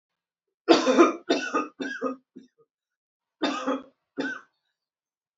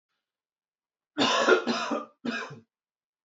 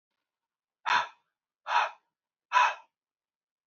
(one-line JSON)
{"three_cough_length": "5.4 s", "three_cough_amplitude": 24873, "three_cough_signal_mean_std_ratio": 0.37, "cough_length": "3.2 s", "cough_amplitude": 13167, "cough_signal_mean_std_ratio": 0.43, "exhalation_length": "3.7 s", "exhalation_amplitude": 11677, "exhalation_signal_mean_std_ratio": 0.32, "survey_phase": "beta (2021-08-13 to 2022-03-07)", "age": "18-44", "gender": "Male", "wearing_mask": "No", "symptom_none": true, "smoker_status": "Ex-smoker", "respiratory_condition_asthma": false, "respiratory_condition_other": false, "recruitment_source": "REACT", "submission_delay": "2 days", "covid_test_result": "Negative", "covid_test_method": "RT-qPCR"}